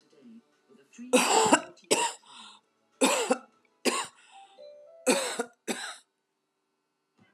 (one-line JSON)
{"three_cough_length": "7.3 s", "three_cough_amplitude": 19524, "three_cough_signal_mean_std_ratio": 0.39, "survey_phase": "beta (2021-08-13 to 2022-03-07)", "age": "45-64", "gender": "Female", "wearing_mask": "No", "symptom_none": true, "smoker_status": "Current smoker (11 or more cigarettes per day)", "respiratory_condition_asthma": false, "respiratory_condition_other": false, "recruitment_source": "REACT", "submission_delay": "2 days", "covid_test_result": "Negative", "covid_test_method": "RT-qPCR", "influenza_a_test_result": "Negative", "influenza_b_test_result": "Negative"}